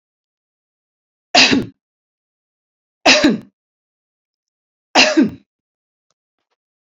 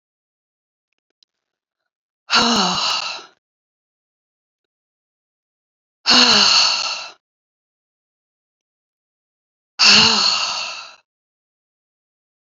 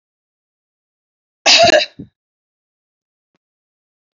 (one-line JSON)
{"three_cough_length": "6.9 s", "three_cough_amplitude": 32768, "three_cough_signal_mean_std_ratio": 0.29, "exhalation_length": "12.5 s", "exhalation_amplitude": 32768, "exhalation_signal_mean_std_ratio": 0.35, "cough_length": "4.2 s", "cough_amplitude": 32699, "cough_signal_mean_std_ratio": 0.25, "survey_phase": "beta (2021-08-13 to 2022-03-07)", "age": "65+", "gender": "Female", "wearing_mask": "No", "symptom_none": true, "smoker_status": "Never smoked", "respiratory_condition_asthma": false, "respiratory_condition_other": false, "recruitment_source": "REACT", "submission_delay": "0 days", "covid_test_result": "Negative", "covid_test_method": "RT-qPCR", "influenza_a_test_result": "Negative", "influenza_b_test_result": "Negative"}